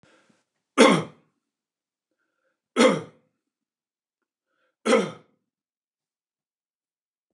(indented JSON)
{
  "three_cough_length": "7.3 s",
  "three_cough_amplitude": 26399,
  "three_cough_signal_mean_std_ratio": 0.23,
  "survey_phase": "beta (2021-08-13 to 2022-03-07)",
  "age": "65+",
  "gender": "Male",
  "wearing_mask": "No",
  "symptom_runny_or_blocked_nose": true,
  "smoker_status": "Ex-smoker",
  "respiratory_condition_asthma": false,
  "respiratory_condition_other": false,
  "recruitment_source": "REACT",
  "submission_delay": "0 days",
  "covid_test_result": "Negative",
  "covid_test_method": "RT-qPCR",
  "influenza_a_test_result": "Negative",
  "influenza_b_test_result": "Negative"
}